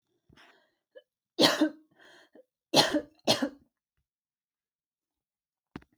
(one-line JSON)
{"three_cough_length": "6.0 s", "three_cough_amplitude": 16073, "three_cough_signal_mean_std_ratio": 0.27, "survey_phase": "alpha (2021-03-01 to 2021-08-12)", "age": "18-44", "gender": "Female", "wearing_mask": "No", "symptom_none": true, "smoker_status": "Never smoked", "respiratory_condition_asthma": false, "respiratory_condition_other": false, "recruitment_source": "REACT", "submission_delay": "1 day", "covid_test_result": "Negative", "covid_test_method": "RT-qPCR"}